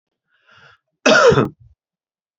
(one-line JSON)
{"cough_length": "2.4 s", "cough_amplitude": 28283, "cough_signal_mean_std_ratio": 0.35, "survey_phase": "beta (2021-08-13 to 2022-03-07)", "age": "45-64", "gender": "Male", "wearing_mask": "No", "symptom_sore_throat": true, "symptom_headache": true, "symptom_onset": "5 days", "smoker_status": "Ex-smoker", "respiratory_condition_asthma": false, "respiratory_condition_other": false, "recruitment_source": "REACT", "submission_delay": "1 day", "covid_test_result": "Negative", "covid_test_method": "RT-qPCR"}